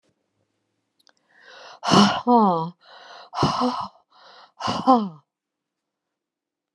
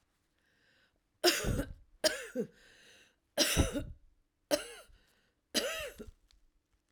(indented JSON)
{
  "exhalation_length": "6.7 s",
  "exhalation_amplitude": 26933,
  "exhalation_signal_mean_std_ratio": 0.38,
  "three_cough_length": "6.9 s",
  "three_cough_amplitude": 8155,
  "three_cough_signal_mean_std_ratio": 0.38,
  "survey_phase": "alpha (2021-03-01 to 2021-08-12)",
  "age": "65+",
  "gender": "Female",
  "wearing_mask": "No",
  "symptom_none": true,
  "smoker_status": "Ex-smoker",
  "respiratory_condition_asthma": false,
  "respiratory_condition_other": false,
  "recruitment_source": "REACT",
  "submission_delay": "1 day",
  "covid_test_result": "Negative",
  "covid_test_method": "RT-qPCR"
}